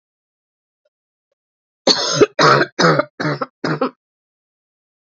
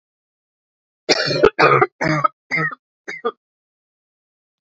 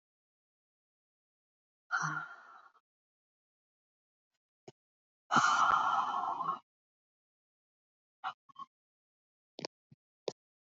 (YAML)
cough_length: 5.1 s
cough_amplitude: 32768
cough_signal_mean_std_ratio: 0.38
three_cough_length: 4.6 s
three_cough_amplitude: 29873
three_cough_signal_mean_std_ratio: 0.38
exhalation_length: 10.7 s
exhalation_amplitude: 6488
exhalation_signal_mean_std_ratio: 0.31
survey_phase: beta (2021-08-13 to 2022-03-07)
age: 18-44
gender: Female
wearing_mask: 'No'
symptom_cough_any: true
symptom_runny_or_blocked_nose: true
symptom_shortness_of_breath: true
symptom_fatigue: true
symptom_fever_high_temperature: true
symptom_headache: true
symptom_change_to_sense_of_smell_or_taste: true
symptom_loss_of_taste: true
symptom_onset: 4 days
smoker_status: Ex-smoker
respiratory_condition_asthma: false
respiratory_condition_other: false
recruitment_source: Test and Trace
submission_delay: 1 day
covid_test_result: Positive
covid_test_method: RT-qPCR